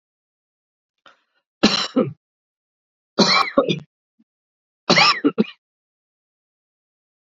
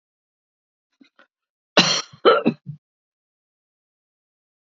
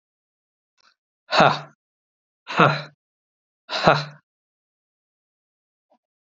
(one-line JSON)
{"three_cough_length": "7.3 s", "three_cough_amplitude": 28545, "three_cough_signal_mean_std_ratio": 0.31, "cough_length": "4.8 s", "cough_amplitude": 30728, "cough_signal_mean_std_ratio": 0.23, "exhalation_length": "6.2 s", "exhalation_amplitude": 28465, "exhalation_signal_mean_std_ratio": 0.26, "survey_phase": "beta (2021-08-13 to 2022-03-07)", "age": "65+", "gender": "Male", "wearing_mask": "No", "symptom_sore_throat": true, "smoker_status": "Never smoked", "respiratory_condition_asthma": false, "respiratory_condition_other": false, "recruitment_source": "REACT", "submission_delay": "2 days", "covid_test_result": "Negative", "covid_test_method": "RT-qPCR", "influenza_a_test_result": "Negative", "influenza_b_test_result": "Negative"}